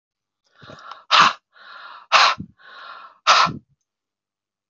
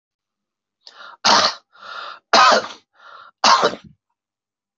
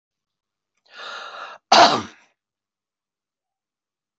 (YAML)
exhalation_length: 4.7 s
exhalation_amplitude: 29288
exhalation_signal_mean_std_ratio: 0.33
three_cough_length: 4.8 s
three_cough_amplitude: 32768
three_cough_signal_mean_std_ratio: 0.36
cough_length: 4.2 s
cough_amplitude: 25543
cough_signal_mean_std_ratio: 0.23
survey_phase: beta (2021-08-13 to 2022-03-07)
age: 45-64
gender: Male
wearing_mask: 'No'
symptom_none: true
smoker_status: Never smoked
respiratory_condition_asthma: false
respiratory_condition_other: false
recruitment_source: REACT
submission_delay: 5 days
covid_test_result: Negative
covid_test_method: RT-qPCR